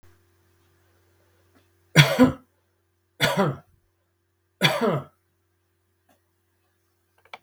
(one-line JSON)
{"three_cough_length": "7.4 s", "three_cough_amplitude": 32768, "three_cough_signal_mean_std_ratio": 0.27, "survey_phase": "beta (2021-08-13 to 2022-03-07)", "age": "65+", "gender": "Male", "wearing_mask": "No", "symptom_none": true, "smoker_status": "Never smoked", "respiratory_condition_asthma": false, "respiratory_condition_other": false, "recruitment_source": "REACT", "submission_delay": "3 days", "covid_test_result": "Negative", "covid_test_method": "RT-qPCR", "influenza_a_test_result": "Negative", "influenza_b_test_result": "Negative"}